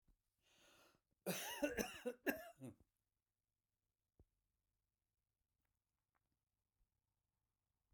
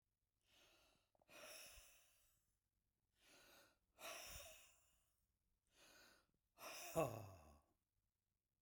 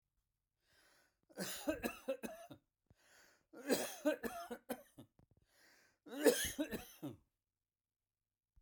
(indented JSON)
{
  "cough_length": "7.9 s",
  "cough_amplitude": 1995,
  "cough_signal_mean_std_ratio": 0.26,
  "exhalation_length": "8.6 s",
  "exhalation_amplitude": 1128,
  "exhalation_signal_mean_std_ratio": 0.31,
  "three_cough_length": "8.6 s",
  "three_cough_amplitude": 4565,
  "three_cough_signal_mean_std_ratio": 0.35,
  "survey_phase": "beta (2021-08-13 to 2022-03-07)",
  "age": "65+",
  "gender": "Male",
  "wearing_mask": "No",
  "symptom_none": true,
  "smoker_status": "Ex-smoker",
  "respiratory_condition_asthma": false,
  "respiratory_condition_other": false,
  "recruitment_source": "REACT",
  "submission_delay": "6 days",
  "covid_test_result": "Negative",
  "covid_test_method": "RT-qPCR"
}